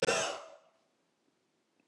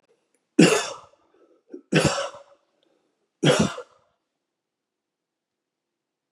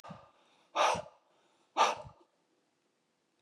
{"cough_length": "1.9 s", "cough_amplitude": 4528, "cough_signal_mean_std_ratio": 0.35, "three_cough_length": "6.3 s", "three_cough_amplitude": 28298, "three_cough_signal_mean_std_ratio": 0.28, "exhalation_length": "3.4 s", "exhalation_amplitude": 7059, "exhalation_signal_mean_std_ratio": 0.31, "survey_phase": "beta (2021-08-13 to 2022-03-07)", "age": "65+", "gender": "Male", "wearing_mask": "No", "symptom_none": true, "smoker_status": "Ex-smoker", "respiratory_condition_asthma": false, "respiratory_condition_other": false, "recruitment_source": "REACT", "submission_delay": "1 day", "covid_test_result": "Negative", "covid_test_method": "RT-qPCR"}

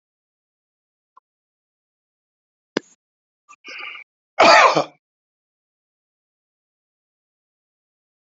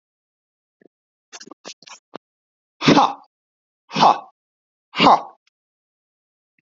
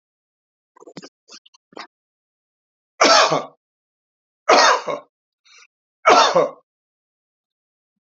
{"cough_length": "8.3 s", "cough_amplitude": 29906, "cough_signal_mean_std_ratio": 0.19, "exhalation_length": "6.7 s", "exhalation_amplitude": 28584, "exhalation_signal_mean_std_ratio": 0.26, "three_cough_length": "8.0 s", "three_cough_amplitude": 29404, "three_cough_signal_mean_std_ratio": 0.31, "survey_phase": "alpha (2021-03-01 to 2021-08-12)", "age": "65+", "gender": "Male", "wearing_mask": "No", "symptom_fatigue": true, "smoker_status": "Never smoked", "respiratory_condition_asthma": false, "respiratory_condition_other": false, "recruitment_source": "REACT", "submission_delay": "1 day", "covid_test_result": "Negative", "covid_test_method": "RT-qPCR"}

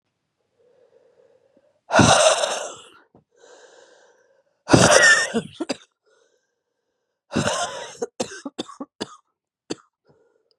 {"exhalation_length": "10.6 s", "exhalation_amplitude": 32768, "exhalation_signal_mean_std_ratio": 0.33, "survey_phase": "beta (2021-08-13 to 2022-03-07)", "age": "18-44", "gender": "Female", "wearing_mask": "No", "symptom_cough_any": true, "symptom_runny_or_blocked_nose": true, "symptom_shortness_of_breath": true, "symptom_headache": true, "symptom_change_to_sense_of_smell_or_taste": true, "symptom_other": true, "symptom_onset": "3 days", "smoker_status": "Ex-smoker", "respiratory_condition_asthma": true, "respiratory_condition_other": false, "recruitment_source": "Test and Trace", "submission_delay": "1 day", "covid_test_result": "Positive", "covid_test_method": "RT-qPCR", "covid_ct_value": 22.6, "covid_ct_gene": "ORF1ab gene"}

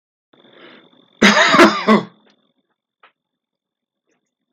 {"cough_length": "4.5 s", "cough_amplitude": 32768, "cough_signal_mean_std_ratio": 0.32, "survey_phase": "beta (2021-08-13 to 2022-03-07)", "age": "45-64", "gender": "Male", "wearing_mask": "No", "symptom_other": true, "smoker_status": "Never smoked", "respiratory_condition_asthma": false, "respiratory_condition_other": false, "recruitment_source": "Test and Trace", "submission_delay": "1 day", "covid_test_result": "Positive", "covid_test_method": "RT-qPCR", "covid_ct_value": 25.4, "covid_ct_gene": "N gene", "covid_ct_mean": 26.0, "covid_viral_load": "2900 copies/ml", "covid_viral_load_category": "Minimal viral load (< 10K copies/ml)"}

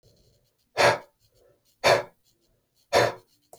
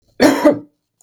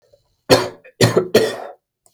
{"exhalation_length": "3.6 s", "exhalation_amplitude": 17143, "exhalation_signal_mean_std_ratio": 0.32, "cough_length": "1.0 s", "cough_amplitude": 32768, "cough_signal_mean_std_ratio": 0.47, "three_cough_length": "2.1 s", "three_cough_amplitude": 32768, "three_cough_signal_mean_std_ratio": 0.42, "survey_phase": "beta (2021-08-13 to 2022-03-07)", "age": "18-44", "gender": "Male", "wearing_mask": "No", "symptom_none": true, "smoker_status": "Never smoked", "respiratory_condition_asthma": true, "respiratory_condition_other": false, "recruitment_source": "REACT", "submission_delay": "1 day", "covid_test_result": "Negative", "covid_test_method": "RT-qPCR", "influenza_a_test_result": "Negative", "influenza_b_test_result": "Negative"}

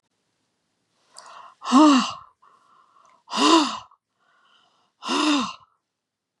{"exhalation_length": "6.4 s", "exhalation_amplitude": 25021, "exhalation_signal_mean_std_ratio": 0.36, "survey_phase": "beta (2021-08-13 to 2022-03-07)", "age": "65+", "gender": "Female", "wearing_mask": "No", "symptom_none": true, "smoker_status": "Ex-smoker", "respiratory_condition_asthma": false, "respiratory_condition_other": false, "recruitment_source": "REACT", "submission_delay": "3 days", "covid_test_result": "Negative", "covid_test_method": "RT-qPCR", "influenza_a_test_result": "Negative", "influenza_b_test_result": "Negative"}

